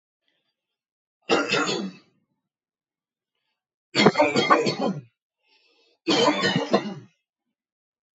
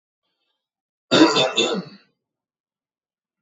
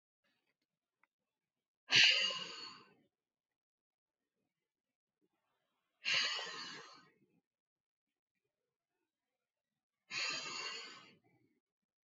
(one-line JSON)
{"three_cough_length": "8.2 s", "three_cough_amplitude": 28423, "three_cough_signal_mean_std_ratio": 0.4, "cough_length": "3.4 s", "cough_amplitude": 27367, "cough_signal_mean_std_ratio": 0.33, "exhalation_length": "12.0 s", "exhalation_amplitude": 6698, "exhalation_signal_mean_std_ratio": 0.26, "survey_phase": "beta (2021-08-13 to 2022-03-07)", "age": "18-44", "gender": "Male", "wearing_mask": "No", "symptom_none": true, "smoker_status": "Never smoked", "respiratory_condition_asthma": false, "respiratory_condition_other": false, "recruitment_source": "REACT", "submission_delay": "1 day", "covid_test_result": "Negative", "covid_test_method": "RT-qPCR"}